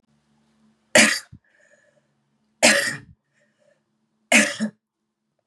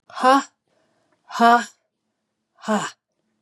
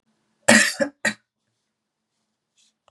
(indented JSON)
{
  "three_cough_length": "5.5 s",
  "three_cough_amplitude": 32725,
  "three_cough_signal_mean_std_ratio": 0.29,
  "exhalation_length": "3.4 s",
  "exhalation_amplitude": 24451,
  "exhalation_signal_mean_std_ratio": 0.33,
  "cough_length": "2.9 s",
  "cough_amplitude": 32767,
  "cough_signal_mean_std_ratio": 0.27,
  "survey_phase": "beta (2021-08-13 to 2022-03-07)",
  "age": "45-64",
  "gender": "Female",
  "wearing_mask": "No",
  "symptom_cough_any": true,
  "symptom_runny_or_blocked_nose": true,
  "symptom_headache": true,
  "symptom_other": true,
  "symptom_onset": "2 days",
  "smoker_status": "Never smoked",
  "respiratory_condition_asthma": false,
  "respiratory_condition_other": false,
  "recruitment_source": "Test and Trace",
  "submission_delay": "1 day",
  "covid_test_result": "Positive",
  "covid_test_method": "RT-qPCR",
  "covid_ct_value": 17.3,
  "covid_ct_gene": "N gene"
}